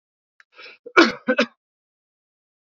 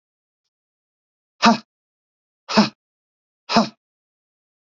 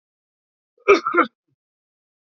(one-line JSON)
{"three_cough_length": "2.6 s", "three_cough_amplitude": 27459, "three_cough_signal_mean_std_ratio": 0.25, "exhalation_length": "4.6 s", "exhalation_amplitude": 28393, "exhalation_signal_mean_std_ratio": 0.23, "cough_length": "2.3 s", "cough_amplitude": 28011, "cough_signal_mean_std_ratio": 0.26, "survey_phase": "beta (2021-08-13 to 2022-03-07)", "age": "45-64", "gender": "Male", "wearing_mask": "No", "symptom_cough_any": true, "symptom_sore_throat": true, "smoker_status": "Ex-smoker", "respiratory_condition_asthma": false, "respiratory_condition_other": true, "recruitment_source": "Test and Trace", "submission_delay": "1 day", "covid_test_result": "Negative", "covid_test_method": "ePCR"}